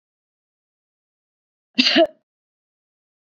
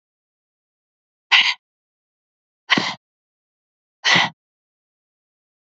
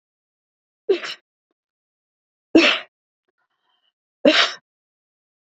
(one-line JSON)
{"cough_length": "3.3 s", "cough_amplitude": 27979, "cough_signal_mean_std_ratio": 0.22, "exhalation_length": "5.7 s", "exhalation_amplitude": 29825, "exhalation_signal_mean_std_ratio": 0.25, "three_cough_length": "5.5 s", "three_cough_amplitude": 27454, "three_cough_signal_mean_std_ratio": 0.25, "survey_phase": "beta (2021-08-13 to 2022-03-07)", "age": "45-64", "gender": "Female", "wearing_mask": "No", "symptom_none": true, "smoker_status": "Never smoked", "respiratory_condition_asthma": false, "respiratory_condition_other": false, "recruitment_source": "REACT", "submission_delay": "2 days", "covid_test_result": "Negative", "covid_test_method": "RT-qPCR"}